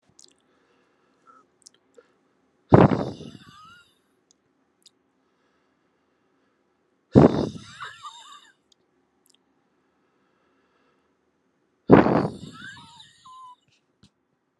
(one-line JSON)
{"exhalation_length": "14.6 s", "exhalation_amplitude": 32755, "exhalation_signal_mean_std_ratio": 0.2, "survey_phase": "alpha (2021-03-01 to 2021-08-12)", "age": "45-64", "gender": "Male", "wearing_mask": "No", "symptom_none": true, "smoker_status": "Never smoked", "respiratory_condition_asthma": false, "respiratory_condition_other": false, "recruitment_source": "REACT", "submission_delay": "2 days", "covid_test_result": "Negative", "covid_test_method": "RT-qPCR"}